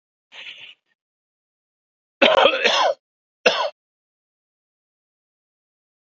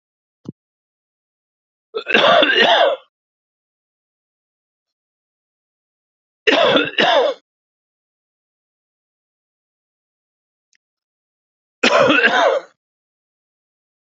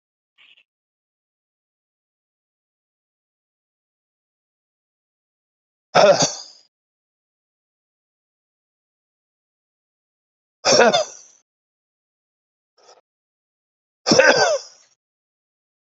{"cough_length": "6.1 s", "cough_amplitude": 28058, "cough_signal_mean_std_ratio": 0.3, "three_cough_length": "14.1 s", "three_cough_amplitude": 28929, "three_cough_signal_mean_std_ratio": 0.34, "exhalation_length": "16.0 s", "exhalation_amplitude": 28866, "exhalation_signal_mean_std_ratio": 0.22, "survey_phase": "alpha (2021-03-01 to 2021-08-12)", "age": "45-64", "gender": "Male", "wearing_mask": "No", "symptom_none": true, "smoker_status": "Ex-smoker", "respiratory_condition_asthma": false, "respiratory_condition_other": true, "recruitment_source": "REACT", "submission_delay": "1 day", "covid_test_result": "Negative", "covid_test_method": "RT-qPCR"}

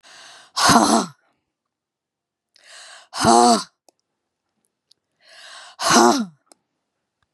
{"exhalation_length": "7.3 s", "exhalation_amplitude": 31739, "exhalation_signal_mean_std_ratio": 0.35, "survey_phase": "beta (2021-08-13 to 2022-03-07)", "age": "45-64", "gender": "Female", "wearing_mask": "No", "symptom_cough_any": true, "smoker_status": "Never smoked", "respiratory_condition_asthma": false, "respiratory_condition_other": false, "recruitment_source": "REACT", "submission_delay": "0 days", "covid_test_result": "Negative", "covid_test_method": "RT-qPCR", "influenza_a_test_result": "Negative", "influenza_b_test_result": "Negative"}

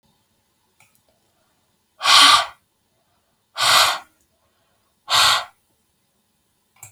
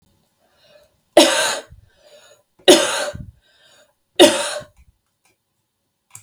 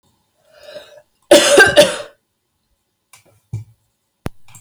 {"exhalation_length": "6.9 s", "exhalation_amplitude": 32768, "exhalation_signal_mean_std_ratio": 0.32, "three_cough_length": "6.2 s", "three_cough_amplitude": 32768, "three_cough_signal_mean_std_ratio": 0.3, "cough_length": "4.6 s", "cough_amplitude": 32768, "cough_signal_mean_std_ratio": 0.31, "survey_phase": "beta (2021-08-13 to 2022-03-07)", "age": "18-44", "gender": "Female", "wearing_mask": "No", "symptom_fatigue": true, "symptom_headache": true, "smoker_status": "Ex-smoker", "respiratory_condition_asthma": false, "respiratory_condition_other": false, "recruitment_source": "REACT", "submission_delay": "2 days", "covid_test_result": "Negative", "covid_test_method": "RT-qPCR", "influenza_a_test_result": "Negative", "influenza_b_test_result": "Negative"}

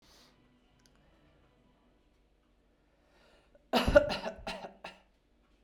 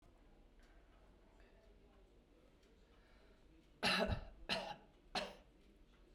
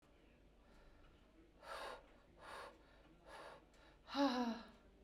{"cough_length": "5.6 s", "cough_amplitude": 13515, "cough_signal_mean_std_ratio": 0.23, "three_cough_length": "6.1 s", "three_cough_amplitude": 2819, "three_cough_signal_mean_std_ratio": 0.37, "exhalation_length": "5.0 s", "exhalation_amplitude": 1505, "exhalation_signal_mean_std_ratio": 0.41, "survey_phase": "beta (2021-08-13 to 2022-03-07)", "age": "45-64", "gender": "Female", "wearing_mask": "No", "symptom_runny_or_blocked_nose": true, "symptom_shortness_of_breath": true, "symptom_sore_throat": true, "symptom_fatigue": true, "symptom_headache": true, "symptom_change_to_sense_of_smell_or_taste": true, "symptom_loss_of_taste": true, "symptom_onset": "1 day", "smoker_status": "Ex-smoker", "respiratory_condition_asthma": false, "respiratory_condition_other": false, "recruitment_source": "Test and Trace", "submission_delay": "1 day", "covid_test_result": "Positive", "covid_test_method": "RT-qPCR", "covid_ct_value": 19.9, "covid_ct_gene": "N gene", "covid_ct_mean": 20.5, "covid_viral_load": "190000 copies/ml", "covid_viral_load_category": "Low viral load (10K-1M copies/ml)"}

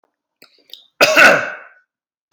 {"cough_length": "2.3 s", "cough_amplitude": 32768, "cough_signal_mean_std_ratio": 0.36, "survey_phase": "beta (2021-08-13 to 2022-03-07)", "age": "18-44", "gender": "Male", "wearing_mask": "No", "symptom_none": true, "smoker_status": "Never smoked", "respiratory_condition_asthma": false, "respiratory_condition_other": false, "recruitment_source": "Test and Trace", "submission_delay": "-1 day", "covid_test_result": "Negative", "covid_test_method": "LFT"}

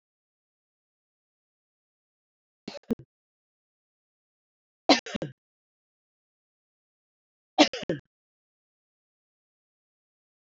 {"three_cough_length": "10.6 s", "three_cough_amplitude": 21069, "three_cough_signal_mean_std_ratio": 0.13, "survey_phase": "beta (2021-08-13 to 2022-03-07)", "age": "45-64", "gender": "Female", "wearing_mask": "No", "symptom_cough_any": true, "symptom_sore_throat": true, "symptom_fatigue": true, "symptom_headache": true, "smoker_status": "Never smoked", "respiratory_condition_asthma": true, "respiratory_condition_other": false, "recruitment_source": "Test and Trace", "submission_delay": "2 days", "covid_test_result": "Positive", "covid_test_method": "RT-qPCR"}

